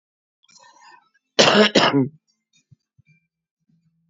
cough_length: 4.1 s
cough_amplitude: 32733
cough_signal_mean_std_ratio: 0.31
survey_phase: beta (2021-08-13 to 2022-03-07)
age: 65+
gender: Female
wearing_mask: 'No'
symptom_cough_any: true
smoker_status: Current smoker (11 or more cigarettes per day)
respiratory_condition_asthma: false
respiratory_condition_other: false
recruitment_source: REACT
submission_delay: 2 days
covid_test_result: Negative
covid_test_method: RT-qPCR
influenza_a_test_result: Negative
influenza_b_test_result: Negative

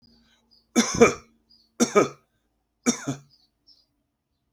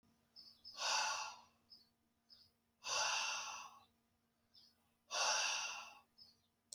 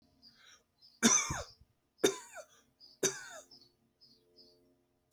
three_cough_length: 4.5 s
three_cough_amplitude: 25967
three_cough_signal_mean_std_ratio: 0.28
exhalation_length: 6.7 s
exhalation_amplitude: 1832
exhalation_signal_mean_std_ratio: 0.49
cough_length: 5.1 s
cough_amplitude: 7803
cough_signal_mean_std_ratio: 0.28
survey_phase: alpha (2021-03-01 to 2021-08-12)
age: 45-64
gender: Male
wearing_mask: 'No'
symptom_none: true
symptom_onset: 5 days
smoker_status: Never smoked
respiratory_condition_asthma: false
respiratory_condition_other: false
recruitment_source: REACT
submission_delay: 1 day
covid_test_result: Negative
covid_test_method: RT-qPCR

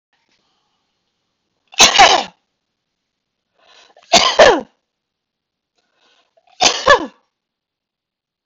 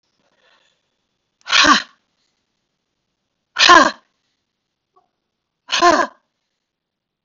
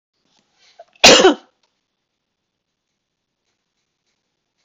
three_cough_length: 8.5 s
three_cough_amplitude: 32768
three_cough_signal_mean_std_ratio: 0.29
exhalation_length: 7.2 s
exhalation_amplitude: 32768
exhalation_signal_mean_std_ratio: 0.27
cough_length: 4.6 s
cough_amplitude: 32768
cough_signal_mean_std_ratio: 0.21
survey_phase: beta (2021-08-13 to 2022-03-07)
age: 45-64
gender: Female
wearing_mask: 'No'
symptom_none: true
smoker_status: Never smoked
respiratory_condition_asthma: true
respiratory_condition_other: false
recruitment_source: REACT
submission_delay: 1 day
covid_test_result: Negative
covid_test_method: RT-qPCR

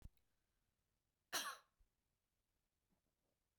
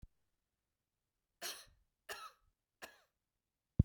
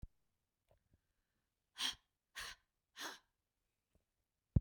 cough_length: 3.6 s
cough_amplitude: 1040
cough_signal_mean_std_ratio: 0.22
three_cough_length: 3.8 s
three_cough_amplitude: 6362
three_cough_signal_mean_std_ratio: 0.14
exhalation_length: 4.6 s
exhalation_amplitude: 4556
exhalation_signal_mean_std_ratio: 0.18
survey_phase: beta (2021-08-13 to 2022-03-07)
age: 45-64
gender: Female
wearing_mask: 'No'
symptom_runny_or_blocked_nose: true
smoker_status: Never smoked
respiratory_condition_asthma: false
respiratory_condition_other: false
recruitment_source: REACT
submission_delay: 1 day
covid_test_result: Negative
covid_test_method: RT-qPCR
influenza_a_test_result: Negative
influenza_b_test_result: Negative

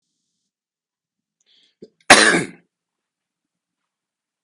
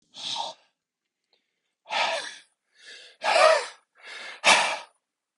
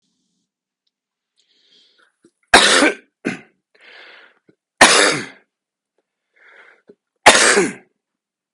cough_length: 4.4 s
cough_amplitude: 32768
cough_signal_mean_std_ratio: 0.2
exhalation_length: 5.4 s
exhalation_amplitude: 19328
exhalation_signal_mean_std_ratio: 0.38
three_cough_length: 8.5 s
three_cough_amplitude: 32768
three_cough_signal_mean_std_ratio: 0.3
survey_phase: beta (2021-08-13 to 2022-03-07)
age: 45-64
gender: Male
wearing_mask: 'No'
symptom_none: true
smoker_status: Ex-smoker
respiratory_condition_asthma: false
respiratory_condition_other: false
recruitment_source: REACT
submission_delay: 4 days
covid_test_result: Negative
covid_test_method: RT-qPCR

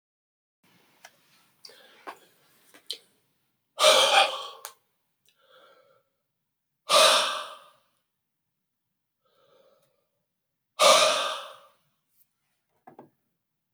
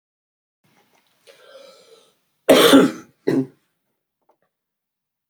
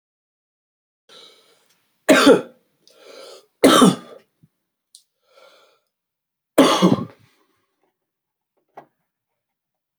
exhalation_length: 13.7 s
exhalation_amplitude: 18302
exhalation_signal_mean_std_ratio: 0.28
cough_length: 5.3 s
cough_amplitude: 30881
cough_signal_mean_std_ratio: 0.27
three_cough_length: 10.0 s
three_cough_amplitude: 31223
three_cough_signal_mean_std_ratio: 0.26
survey_phase: beta (2021-08-13 to 2022-03-07)
age: 65+
gender: Female
wearing_mask: 'No'
symptom_fatigue: true
symptom_headache: true
symptom_other: true
smoker_status: Never smoked
respiratory_condition_asthma: false
respiratory_condition_other: false
recruitment_source: Test and Trace
submission_delay: 2 days
covid_test_result: Positive
covid_test_method: RT-qPCR
covid_ct_value: 20.3
covid_ct_gene: ORF1ab gene
covid_ct_mean: 20.9
covid_viral_load: 140000 copies/ml
covid_viral_load_category: Low viral load (10K-1M copies/ml)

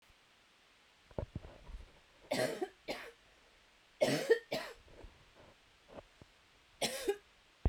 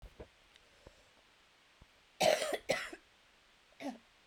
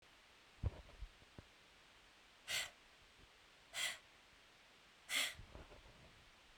three_cough_length: 7.7 s
three_cough_amplitude: 4663
three_cough_signal_mean_std_ratio: 0.36
cough_length: 4.3 s
cough_amplitude: 5537
cough_signal_mean_std_ratio: 0.32
exhalation_length: 6.6 s
exhalation_amplitude: 1517
exhalation_signal_mean_std_ratio: 0.41
survey_phase: beta (2021-08-13 to 2022-03-07)
age: 18-44
gender: Female
wearing_mask: 'No'
symptom_cough_any: true
symptom_runny_or_blocked_nose: true
symptom_sore_throat: true
symptom_diarrhoea: true
symptom_change_to_sense_of_smell_or_taste: true
symptom_onset: 2 days
smoker_status: Never smoked
respiratory_condition_asthma: false
respiratory_condition_other: false
recruitment_source: Test and Trace
submission_delay: 2 days
covid_test_result: Positive
covid_test_method: RT-qPCR
covid_ct_value: 11.9
covid_ct_gene: ORF1ab gene
covid_ct_mean: 12.4
covid_viral_load: 83000000 copies/ml
covid_viral_load_category: High viral load (>1M copies/ml)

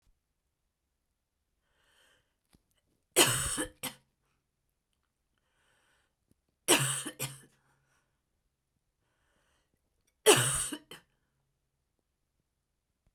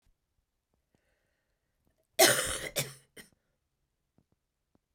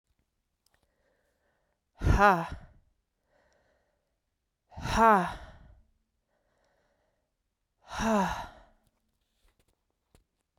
three_cough_length: 13.1 s
three_cough_amplitude: 14697
three_cough_signal_mean_std_ratio: 0.23
cough_length: 4.9 s
cough_amplitude: 13260
cough_signal_mean_std_ratio: 0.22
exhalation_length: 10.6 s
exhalation_amplitude: 12874
exhalation_signal_mean_std_ratio: 0.27
survey_phase: beta (2021-08-13 to 2022-03-07)
age: 45-64
gender: Female
wearing_mask: 'No'
symptom_cough_any: true
symptom_runny_or_blocked_nose: true
symptom_fatigue: true
symptom_fever_high_temperature: true
symptom_other: true
symptom_onset: 5 days
smoker_status: Never smoked
respiratory_condition_asthma: false
respiratory_condition_other: false
recruitment_source: Test and Trace
submission_delay: 2 days
covid_test_result: Positive
covid_test_method: RT-qPCR
covid_ct_value: 19.9
covid_ct_gene: ORF1ab gene
covid_ct_mean: 20.5
covid_viral_load: 190000 copies/ml
covid_viral_load_category: Low viral load (10K-1M copies/ml)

